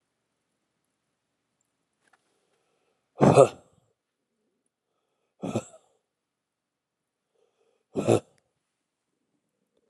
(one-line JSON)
{"exhalation_length": "9.9 s", "exhalation_amplitude": 23741, "exhalation_signal_mean_std_ratio": 0.17, "survey_phase": "beta (2021-08-13 to 2022-03-07)", "age": "45-64", "gender": "Male", "wearing_mask": "No", "symptom_cough_any": true, "symptom_runny_or_blocked_nose": true, "symptom_sore_throat": true, "symptom_fatigue": true, "symptom_onset": "3 days", "smoker_status": "Never smoked", "respiratory_condition_asthma": false, "respiratory_condition_other": true, "recruitment_source": "Test and Trace", "submission_delay": "2 days", "covid_test_result": "Positive", "covid_test_method": "RT-qPCR", "covid_ct_value": 23.1, "covid_ct_gene": "ORF1ab gene", "covid_ct_mean": 24.5, "covid_viral_load": "8900 copies/ml", "covid_viral_load_category": "Minimal viral load (< 10K copies/ml)"}